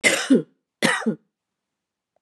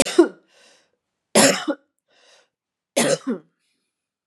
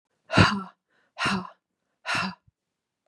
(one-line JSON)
{"cough_length": "2.2 s", "cough_amplitude": 25554, "cough_signal_mean_std_ratio": 0.4, "three_cough_length": "4.3 s", "three_cough_amplitude": 29713, "three_cough_signal_mean_std_ratio": 0.32, "exhalation_length": "3.1 s", "exhalation_amplitude": 21559, "exhalation_signal_mean_std_ratio": 0.36, "survey_phase": "beta (2021-08-13 to 2022-03-07)", "age": "45-64", "gender": "Female", "wearing_mask": "No", "symptom_change_to_sense_of_smell_or_taste": true, "smoker_status": "Ex-smoker", "respiratory_condition_asthma": false, "respiratory_condition_other": false, "recruitment_source": "REACT", "submission_delay": "2 days", "covid_test_result": "Negative", "covid_test_method": "RT-qPCR", "influenza_a_test_result": "Negative", "influenza_b_test_result": "Negative"}